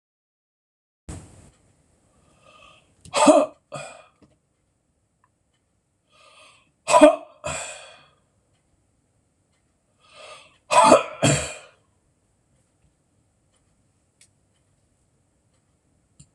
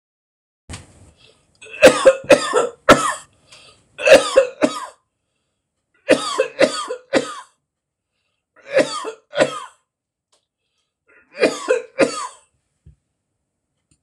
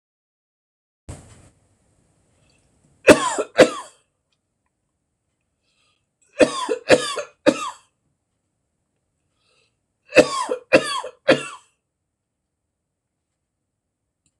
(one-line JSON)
{"exhalation_length": "16.3 s", "exhalation_amplitude": 26028, "exhalation_signal_mean_std_ratio": 0.22, "cough_length": "14.0 s", "cough_amplitude": 26028, "cough_signal_mean_std_ratio": 0.33, "three_cough_length": "14.4 s", "three_cough_amplitude": 26028, "three_cough_signal_mean_std_ratio": 0.24, "survey_phase": "alpha (2021-03-01 to 2021-08-12)", "age": "45-64", "gender": "Male", "wearing_mask": "No", "symptom_none": true, "smoker_status": "Never smoked", "respiratory_condition_asthma": false, "respiratory_condition_other": false, "recruitment_source": "REACT", "submission_delay": "3 days", "covid_test_result": "Negative", "covid_test_method": "RT-qPCR"}